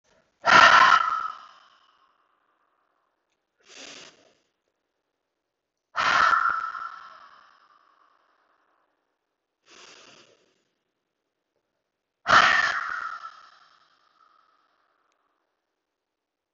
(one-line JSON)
{"exhalation_length": "16.5 s", "exhalation_amplitude": 26269, "exhalation_signal_mean_std_ratio": 0.28, "survey_phase": "beta (2021-08-13 to 2022-03-07)", "age": "45-64", "gender": "Male", "wearing_mask": "No", "symptom_cough_any": true, "symptom_runny_or_blocked_nose": true, "smoker_status": "Ex-smoker", "respiratory_condition_asthma": false, "respiratory_condition_other": false, "recruitment_source": "Test and Trace", "submission_delay": "2 days", "covid_test_result": "Positive", "covid_test_method": "LFT"}